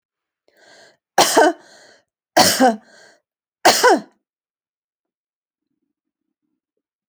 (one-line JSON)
{"three_cough_length": "7.1 s", "three_cough_amplitude": 32767, "three_cough_signal_mean_std_ratio": 0.3, "survey_phase": "alpha (2021-03-01 to 2021-08-12)", "age": "45-64", "gender": "Female", "wearing_mask": "No", "symptom_none": true, "smoker_status": "Never smoked", "respiratory_condition_asthma": false, "respiratory_condition_other": false, "recruitment_source": "REACT", "submission_delay": "1 day", "covid_test_result": "Negative", "covid_test_method": "RT-qPCR"}